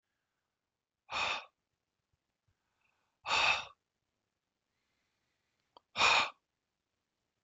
exhalation_length: 7.4 s
exhalation_amplitude: 5989
exhalation_signal_mean_std_ratio: 0.27
survey_phase: beta (2021-08-13 to 2022-03-07)
age: 45-64
gender: Male
wearing_mask: 'No'
symptom_cough_any: true
symptom_runny_or_blocked_nose: true
symptom_fatigue: true
symptom_headache: true
symptom_onset: 4 days
smoker_status: Never smoked
respiratory_condition_asthma: false
respiratory_condition_other: false
recruitment_source: Test and Trace
submission_delay: 1 day
covid_test_result: Negative
covid_test_method: RT-qPCR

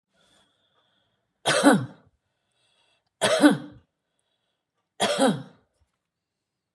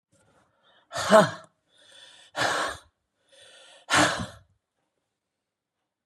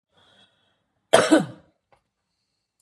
three_cough_length: 6.7 s
three_cough_amplitude: 25249
three_cough_signal_mean_std_ratio: 0.31
exhalation_length: 6.1 s
exhalation_amplitude: 24742
exhalation_signal_mean_std_ratio: 0.29
cough_length: 2.8 s
cough_amplitude: 32611
cough_signal_mean_std_ratio: 0.24
survey_phase: beta (2021-08-13 to 2022-03-07)
age: 65+
gender: Female
wearing_mask: 'No'
symptom_none: true
smoker_status: Current smoker (11 or more cigarettes per day)
respiratory_condition_asthma: false
respiratory_condition_other: false
recruitment_source: REACT
submission_delay: 1 day
covid_test_result: Negative
covid_test_method: RT-qPCR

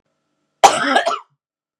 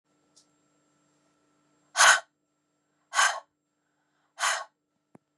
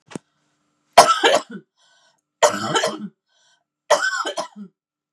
cough_length: 1.8 s
cough_amplitude: 32768
cough_signal_mean_std_ratio: 0.37
exhalation_length: 5.4 s
exhalation_amplitude: 18606
exhalation_signal_mean_std_ratio: 0.25
three_cough_length: 5.1 s
three_cough_amplitude: 32768
three_cough_signal_mean_std_ratio: 0.36
survey_phase: beta (2021-08-13 to 2022-03-07)
age: 45-64
gender: Female
wearing_mask: 'No'
symptom_cough_any: true
symptom_headache: true
symptom_other: true
symptom_onset: 3 days
smoker_status: Never smoked
respiratory_condition_asthma: false
respiratory_condition_other: false
recruitment_source: Test and Trace
submission_delay: 2 days
covid_test_result: Positive
covid_test_method: RT-qPCR
covid_ct_value: 27.8
covid_ct_gene: N gene
covid_ct_mean: 27.9
covid_viral_load: 700 copies/ml
covid_viral_load_category: Minimal viral load (< 10K copies/ml)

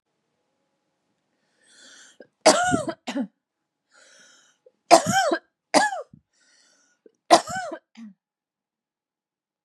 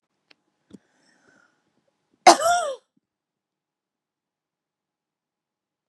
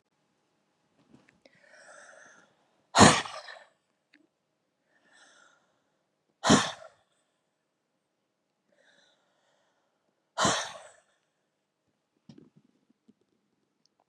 three_cough_length: 9.6 s
three_cough_amplitude: 32767
three_cough_signal_mean_std_ratio: 0.27
cough_length: 5.9 s
cough_amplitude: 32376
cough_signal_mean_std_ratio: 0.17
exhalation_length: 14.1 s
exhalation_amplitude: 22469
exhalation_signal_mean_std_ratio: 0.18
survey_phase: beta (2021-08-13 to 2022-03-07)
age: 18-44
gender: Female
wearing_mask: 'No'
symptom_none: true
smoker_status: Never smoked
respiratory_condition_asthma: false
respiratory_condition_other: false
recruitment_source: REACT
submission_delay: 1 day
covid_test_result: Negative
covid_test_method: RT-qPCR
influenza_a_test_result: Negative
influenza_b_test_result: Negative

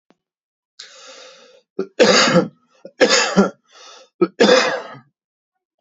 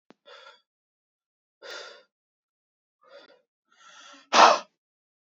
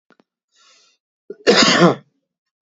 three_cough_length: 5.8 s
three_cough_amplitude: 28683
three_cough_signal_mean_std_ratio: 0.41
exhalation_length: 5.2 s
exhalation_amplitude: 25911
exhalation_signal_mean_std_ratio: 0.19
cough_length: 2.6 s
cough_amplitude: 31684
cough_signal_mean_std_ratio: 0.36
survey_phase: beta (2021-08-13 to 2022-03-07)
age: 18-44
gender: Male
wearing_mask: 'No'
symptom_cough_any: true
symptom_fatigue: true
symptom_headache: true
smoker_status: Never smoked
respiratory_condition_asthma: false
respiratory_condition_other: false
recruitment_source: Test and Trace
submission_delay: 1 day
covid_test_result: Positive
covid_test_method: RT-qPCR
covid_ct_value: 31.6
covid_ct_gene: N gene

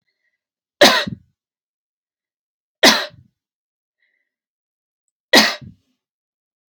three_cough_length: 6.7 s
three_cough_amplitude: 32464
three_cough_signal_mean_std_ratio: 0.23
survey_phase: alpha (2021-03-01 to 2021-08-12)
age: 18-44
gender: Female
wearing_mask: 'No'
symptom_none: true
smoker_status: Never smoked
respiratory_condition_asthma: false
respiratory_condition_other: false
recruitment_source: REACT
submission_delay: 1 day
covid_test_result: Negative
covid_test_method: RT-qPCR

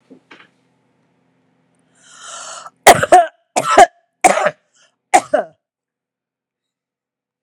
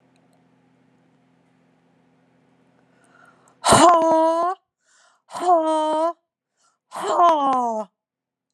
cough_length: 7.4 s
cough_amplitude: 32768
cough_signal_mean_std_ratio: 0.28
exhalation_length: 8.5 s
exhalation_amplitude: 29697
exhalation_signal_mean_std_ratio: 0.44
survey_phase: alpha (2021-03-01 to 2021-08-12)
age: 45-64
gender: Female
wearing_mask: 'No'
symptom_none: true
smoker_status: Ex-smoker
respiratory_condition_asthma: false
respiratory_condition_other: false
recruitment_source: REACT
submission_delay: 3 days
covid_test_result: Negative
covid_test_method: RT-qPCR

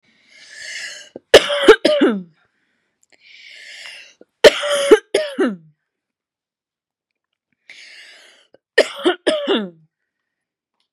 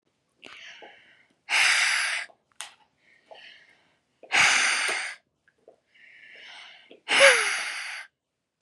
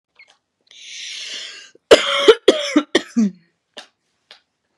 three_cough_length: 10.9 s
three_cough_amplitude: 32768
three_cough_signal_mean_std_ratio: 0.31
exhalation_length: 8.6 s
exhalation_amplitude: 26047
exhalation_signal_mean_std_ratio: 0.41
cough_length: 4.8 s
cough_amplitude: 32768
cough_signal_mean_std_ratio: 0.33
survey_phase: beta (2021-08-13 to 2022-03-07)
age: 18-44
gender: Female
wearing_mask: 'No'
symptom_headache: true
symptom_onset: 7 days
smoker_status: Never smoked
respiratory_condition_asthma: true
respiratory_condition_other: false
recruitment_source: REACT
submission_delay: 3 days
covid_test_result: Negative
covid_test_method: RT-qPCR
influenza_a_test_result: Negative
influenza_b_test_result: Negative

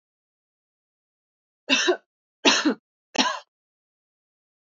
three_cough_length: 4.7 s
three_cough_amplitude: 25598
three_cough_signal_mean_std_ratio: 0.3
survey_phase: alpha (2021-03-01 to 2021-08-12)
age: 18-44
gender: Female
wearing_mask: 'No'
symptom_none: true
smoker_status: Never smoked
respiratory_condition_asthma: false
respiratory_condition_other: false
recruitment_source: REACT
submission_delay: 1 day
covid_test_result: Negative
covid_test_method: RT-qPCR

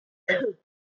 cough_length: 0.9 s
cough_amplitude: 8833
cough_signal_mean_std_ratio: 0.45
survey_phase: beta (2021-08-13 to 2022-03-07)
age: 18-44
gender: Female
wearing_mask: 'No'
symptom_cough_any: true
symptom_runny_or_blocked_nose: true
symptom_sore_throat: true
symptom_fatigue: true
symptom_headache: true
symptom_onset: 3 days
smoker_status: Ex-smoker
respiratory_condition_asthma: false
respiratory_condition_other: false
recruitment_source: Test and Trace
submission_delay: 2 days
covid_test_result: Positive
covid_test_method: ePCR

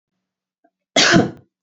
cough_length: 1.6 s
cough_amplitude: 31528
cough_signal_mean_std_ratio: 0.36
survey_phase: beta (2021-08-13 to 2022-03-07)
age: 45-64
gender: Female
wearing_mask: 'No'
symptom_runny_or_blocked_nose: true
symptom_fatigue: true
symptom_headache: true
symptom_other: true
smoker_status: Never smoked
respiratory_condition_asthma: false
respiratory_condition_other: false
recruitment_source: Test and Trace
submission_delay: 0 days
covid_test_result: Negative
covid_test_method: RT-qPCR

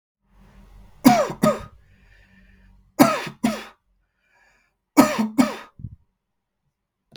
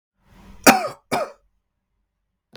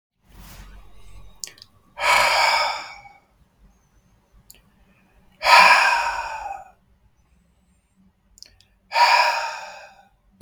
three_cough_length: 7.2 s
three_cough_amplitude: 32768
three_cough_signal_mean_std_ratio: 0.31
cough_length: 2.6 s
cough_amplitude: 32768
cough_signal_mean_std_ratio: 0.25
exhalation_length: 10.4 s
exhalation_amplitude: 32768
exhalation_signal_mean_std_ratio: 0.39
survey_phase: beta (2021-08-13 to 2022-03-07)
age: 18-44
gender: Male
wearing_mask: 'No'
symptom_runny_or_blocked_nose: true
symptom_onset: 12 days
smoker_status: Never smoked
respiratory_condition_asthma: false
respiratory_condition_other: false
recruitment_source: REACT
submission_delay: 1 day
covid_test_result: Negative
covid_test_method: RT-qPCR
influenza_a_test_result: Negative
influenza_b_test_result: Negative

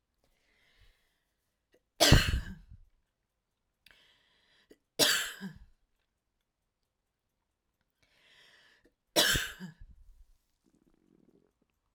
three_cough_length: 11.9 s
three_cough_amplitude: 14036
three_cough_signal_mean_std_ratio: 0.23
survey_phase: alpha (2021-03-01 to 2021-08-12)
age: 65+
gender: Female
wearing_mask: 'No'
symptom_abdominal_pain: true
symptom_fatigue: true
symptom_headache: true
symptom_onset: 12 days
smoker_status: Ex-smoker
respiratory_condition_asthma: false
respiratory_condition_other: false
recruitment_source: REACT
submission_delay: 2 days
covid_test_result: Negative
covid_test_method: RT-qPCR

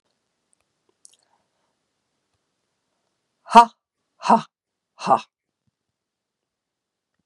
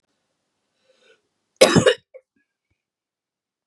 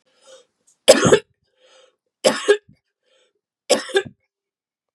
exhalation_length: 7.3 s
exhalation_amplitude: 32768
exhalation_signal_mean_std_ratio: 0.16
cough_length: 3.7 s
cough_amplitude: 32768
cough_signal_mean_std_ratio: 0.21
three_cough_length: 4.9 s
three_cough_amplitude: 32768
three_cough_signal_mean_std_ratio: 0.28
survey_phase: beta (2021-08-13 to 2022-03-07)
age: 45-64
gender: Female
wearing_mask: 'No'
symptom_runny_or_blocked_nose: true
smoker_status: Never smoked
respiratory_condition_asthma: false
respiratory_condition_other: false
recruitment_source: REACT
submission_delay: 2 days
covid_test_result: Negative
covid_test_method: RT-qPCR
influenza_a_test_result: Negative
influenza_b_test_result: Negative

